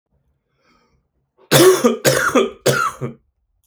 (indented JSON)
{
  "three_cough_length": "3.7 s",
  "three_cough_amplitude": 32422,
  "three_cough_signal_mean_std_ratio": 0.45,
  "survey_phase": "beta (2021-08-13 to 2022-03-07)",
  "age": "45-64",
  "gender": "Male",
  "wearing_mask": "No",
  "symptom_cough_any": true,
  "symptom_runny_or_blocked_nose": true,
  "symptom_shortness_of_breath": true,
  "symptom_sore_throat": true,
  "symptom_fatigue": true,
  "symptom_fever_high_temperature": true,
  "symptom_headache": true,
  "symptom_onset": "3 days",
  "smoker_status": "Ex-smoker",
  "respiratory_condition_asthma": false,
  "respiratory_condition_other": false,
  "recruitment_source": "Test and Trace",
  "submission_delay": "1 day",
  "covid_test_result": "Positive",
  "covid_test_method": "RT-qPCR"
}